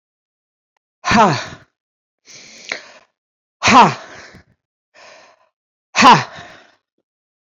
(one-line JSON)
{"exhalation_length": "7.6 s", "exhalation_amplitude": 29195, "exhalation_signal_mean_std_ratio": 0.29, "survey_phase": "beta (2021-08-13 to 2022-03-07)", "age": "65+", "gender": "Female", "wearing_mask": "No", "symptom_none": true, "smoker_status": "Current smoker (11 or more cigarettes per day)", "respiratory_condition_asthma": false, "respiratory_condition_other": false, "recruitment_source": "REACT", "submission_delay": "2 days", "covid_test_result": "Negative", "covid_test_method": "RT-qPCR", "influenza_a_test_result": "Negative", "influenza_b_test_result": "Negative"}